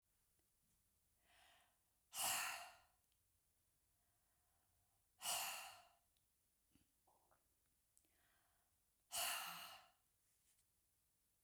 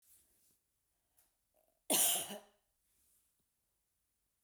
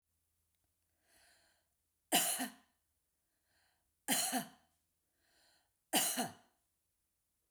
{"exhalation_length": "11.4 s", "exhalation_amplitude": 1009, "exhalation_signal_mean_std_ratio": 0.32, "cough_length": "4.4 s", "cough_amplitude": 4413, "cough_signal_mean_std_ratio": 0.24, "three_cough_length": "7.5 s", "three_cough_amplitude": 4622, "three_cough_signal_mean_std_ratio": 0.3, "survey_phase": "beta (2021-08-13 to 2022-03-07)", "age": "65+", "gender": "Female", "wearing_mask": "No", "symptom_none": true, "smoker_status": "Never smoked", "respiratory_condition_asthma": false, "respiratory_condition_other": false, "recruitment_source": "REACT", "submission_delay": "0 days", "covid_test_result": "Negative", "covid_test_method": "RT-qPCR"}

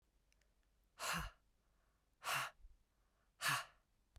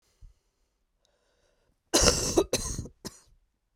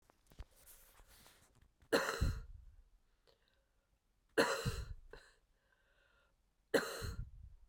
{"exhalation_length": "4.2 s", "exhalation_amplitude": 1610, "exhalation_signal_mean_std_ratio": 0.37, "cough_length": "3.8 s", "cough_amplitude": 17437, "cough_signal_mean_std_ratio": 0.34, "three_cough_length": "7.7 s", "three_cough_amplitude": 5419, "three_cough_signal_mean_std_ratio": 0.35, "survey_phase": "beta (2021-08-13 to 2022-03-07)", "age": "18-44", "gender": "Female", "wearing_mask": "No", "symptom_cough_any": true, "symptom_fatigue": true, "symptom_other": true, "smoker_status": "Never smoked", "respiratory_condition_asthma": true, "respiratory_condition_other": false, "recruitment_source": "Test and Trace", "submission_delay": "4 days", "covid_test_result": "Positive", "covid_test_method": "RT-qPCR", "covid_ct_value": 22.3, "covid_ct_gene": "N gene"}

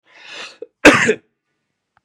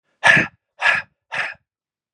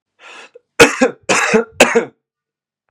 {"cough_length": "2.0 s", "cough_amplitude": 32768, "cough_signal_mean_std_ratio": 0.3, "exhalation_length": "2.1 s", "exhalation_amplitude": 32422, "exhalation_signal_mean_std_ratio": 0.38, "three_cough_length": "2.9 s", "three_cough_amplitude": 32768, "three_cough_signal_mean_std_ratio": 0.41, "survey_phase": "beta (2021-08-13 to 2022-03-07)", "age": "45-64", "gender": "Male", "wearing_mask": "No", "symptom_cough_any": true, "symptom_runny_or_blocked_nose": true, "symptom_sore_throat": true, "symptom_onset": "3 days", "smoker_status": "Never smoked", "respiratory_condition_asthma": false, "respiratory_condition_other": false, "recruitment_source": "Test and Trace", "submission_delay": "1 day", "covid_test_result": "Positive", "covid_test_method": "RT-qPCR", "covid_ct_value": 21.4, "covid_ct_gene": "ORF1ab gene"}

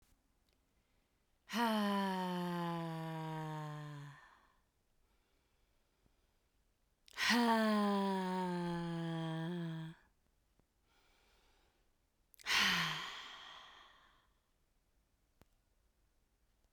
{"exhalation_length": "16.7 s", "exhalation_amplitude": 4110, "exhalation_signal_mean_std_ratio": 0.51, "survey_phase": "beta (2021-08-13 to 2022-03-07)", "age": "18-44", "gender": "Female", "wearing_mask": "No", "symptom_none": true, "smoker_status": "Never smoked", "respiratory_condition_asthma": true, "respiratory_condition_other": false, "recruitment_source": "Test and Trace", "submission_delay": "1 day", "covid_test_result": "Positive", "covid_test_method": "LFT"}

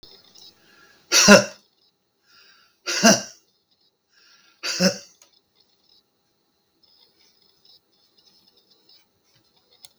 {"exhalation_length": "10.0 s", "exhalation_amplitude": 32768, "exhalation_signal_mean_std_ratio": 0.22, "survey_phase": "beta (2021-08-13 to 2022-03-07)", "age": "65+", "gender": "Male", "wearing_mask": "No", "symptom_none": true, "smoker_status": "Ex-smoker", "respiratory_condition_asthma": false, "respiratory_condition_other": true, "recruitment_source": "REACT", "submission_delay": "3 days", "covid_test_result": "Negative", "covid_test_method": "RT-qPCR", "influenza_a_test_result": "Negative", "influenza_b_test_result": "Negative"}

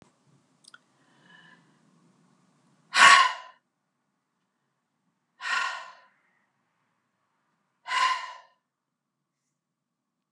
{"exhalation_length": "10.3 s", "exhalation_amplitude": 24554, "exhalation_signal_mean_std_ratio": 0.22, "survey_phase": "alpha (2021-03-01 to 2021-08-12)", "age": "45-64", "gender": "Female", "wearing_mask": "No", "symptom_none": true, "smoker_status": "Current smoker (e-cigarettes or vapes only)", "respiratory_condition_asthma": false, "respiratory_condition_other": false, "recruitment_source": "REACT", "submission_delay": "1 day", "covid_test_result": "Negative", "covid_test_method": "RT-qPCR"}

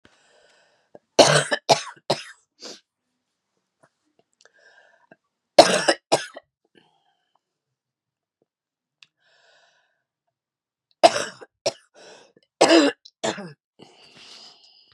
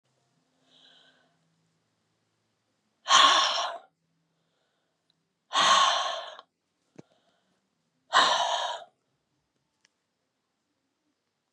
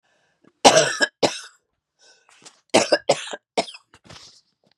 {"three_cough_length": "14.9 s", "three_cough_amplitude": 32768, "three_cough_signal_mean_std_ratio": 0.23, "exhalation_length": "11.5 s", "exhalation_amplitude": 17823, "exhalation_signal_mean_std_ratio": 0.31, "cough_length": "4.8 s", "cough_amplitude": 32768, "cough_signal_mean_std_ratio": 0.31, "survey_phase": "beta (2021-08-13 to 2022-03-07)", "age": "65+", "gender": "Female", "wearing_mask": "No", "symptom_cough_any": true, "symptom_runny_or_blocked_nose": true, "symptom_sore_throat": true, "symptom_headache": true, "smoker_status": "Ex-smoker", "respiratory_condition_asthma": false, "respiratory_condition_other": false, "recruitment_source": "Test and Trace", "submission_delay": "2 days", "covid_test_result": "Positive", "covid_test_method": "LFT"}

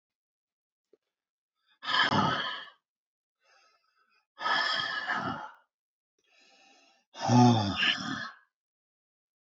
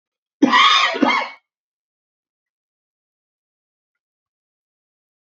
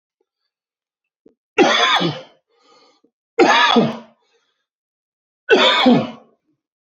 {"exhalation_length": "9.5 s", "exhalation_amplitude": 9932, "exhalation_signal_mean_std_ratio": 0.39, "cough_length": "5.4 s", "cough_amplitude": 27592, "cough_signal_mean_std_ratio": 0.3, "three_cough_length": "7.0 s", "three_cough_amplitude": 29992, "three_cough_signal_mean_std_ratio": 0.41, "survey_phase": "beta (2021-08-13 to 2022-03-07)", "age": "65+", "gender": "Male", "wearing_mask": "No", "symptom_cough_any": true, "symptom_runny_or_blocked_nose": true, "symptom_change_to_sense_of_smell_or_taste": true, "symptom_loss_of_taste": true, "symptom_onset": "4 days", "smoker_status": "Never smoked", "respiratory_condition_asthma": false, "respiratory_condition_other": false, "recruitment_source": "Test and Trace", "submission_delay": "1 day", "covid_test_result": "Positive", "covid_test_method": "RT-qPCR", "covid_ct_value": 16.3, "covid_ct_gene": "ORF1ab gene", "covid_ct_mean": 16.5, "covid_viral_load": "3800000 copies/ml", "covid_viral_load_category": "High viral load (>1M copies/ml)"}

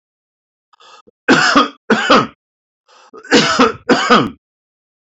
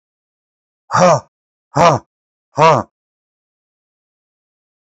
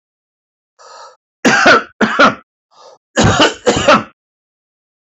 {"three_cough_length": "5.1 s", "three_cough_amplitude": 29908, "three_cough_signal_mean_std_ratio": 0.46, "exhalation_length": "4.9 s", "exhalation_amplitude": 32767, "exhalation_signal_mean_std_ratio": 0.3, "cough_length": "5.1 s", "cough_amplitude": 30187, "cough_signal_mean_std_ratio": 0.44, "survey_phase": "beta (2021-08-13 to 2022-03-07)", "age": "45-64", "gender": "Male", "wearing_mask": "No", "symptom_none": true, "smoker_status": "Never smoked", "respiratory_condition_asthma": false, "respiratory_condition_other": false, "recruitment_source": "REACT", "submission_delay": "2 days", "covid_test_result": "Negative", "covid_test_method": "RT-qPCR", "influenza_a_test_result": "Unknown/Void", "influenza_b_test_result": "Unknown/Void"}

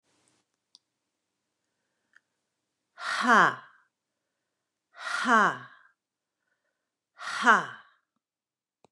{"exhalation_length": "8.9 s", "exhalation_amplitude": 16967, "exhalation_signal_mean_std_ratio": 0.26, "survey_phase": "beta (2021-08-13 to 2022-03-07)", "age": "45-64", "gender": "Female", "wearing_mask": "No", "symptom_none": true, "smoker_status": "Ex-smoker", "respiratory_condition_asthma": false, "respiratory_condition_other": false, "recruitment_source": "REACT", "submission_delay": "1 day", "covid_test_result": "Negative", "covid_test_method": "RT-qPCR", "influenza_a_test_result": "Negative", "influenza_b_test_result": "Negative"}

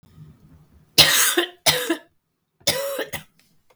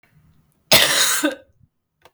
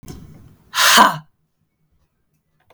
{"three_cough_length": "3.8 s", "three_cough_amplitude": 32768, "three_cough_signal_mean_std_ratio": 0.41, "cough_length": "2.1 s", "cough_amplitude": 32768, "cough_signal_mean_std_ratio": 0.42, "exhalation_length": "2.7 s", "exhalation_amplitude": 32768, "exhalation_signal_mean_std_ratio": 0.32, "survey_phase": "beta (2021-08-13 to 2022-03-07)", "age": "45-64", "gender": "Female", "wearing_mask": "No", "symptom_cough_any": true, "symptom_runny_or_blocked_nose": true, "smoker_status": "Never smoked", "respiratory_condition_asthma": true, "respiratory_condition_other": false, "recruitment_source": "Test and Trace", "submission_delay": "2 days", "covid_test_result": "Positive", "covid_test_method": "RT-qPCR", "covid_ct_value": 16.8, "covid_ct_gene": "ORF1ab gene", "covid_ct_mean": 17.8, "covid_viral_load": "1400000 copies/ml", "covid_viral_load_category": "High viral load (>1M copies/ml)"}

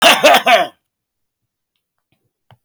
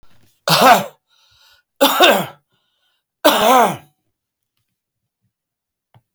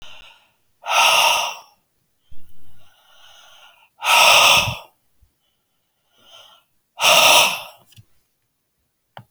{"cough_length": "2.6 s", "cough_amplitude": 32767, "cough_signal_mean_std_ratio": 0.38, "three_cough_length": "6.1 s", "three_cough_amplitude": 32767, "three_cough_signal_mean_std_ratio": 0.36, "exhalation_length": "9.3 s", "exhalation_amplitude": 32768, "exhalation_signal_mean_std_ratio": 0.4, "survey_phase": "beta (2021-08-13 to 2022-03-07)", "age": "45-64", "gender": "Male", "wearing_mask": "No", "symptom_none": true, "smoker_status": "Never smoked", "respiratory_condition_asthma": false, "respiratory_condition_other": false, "recruitment_source": "REACT", "submission_delay": "3 days", "covid_test_result": "Negative", "covid_test_method": "RT-qPCR"}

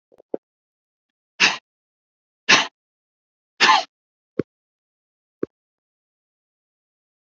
{"exhalation_length": "7.3 s", "exhalation_amplitude": 29432, "exhalation_signal_mean_std_ratio": 0.21, "survey_phase": "alpha (2021-03-01 to 2021-08-12)", "age": "18-44", "gender": "Male", "wearing_mask": "No", "symptom_diarrhoea": true, "symptom_fatigue": true, "symptom_headache": true, "symptom_change_to_sense_of_smell_or_taste": true, "symptom_loss_of_taste": true, "smoker_status": "Never smoked", "respiratory_condition_asthma": false, "respiratory_condition_other": false, "recruitment_source": "Test and Trace", "submission_delay": "2 days", "covid_test_result": "Positive", "covid_test_method": "RT-qPCR"}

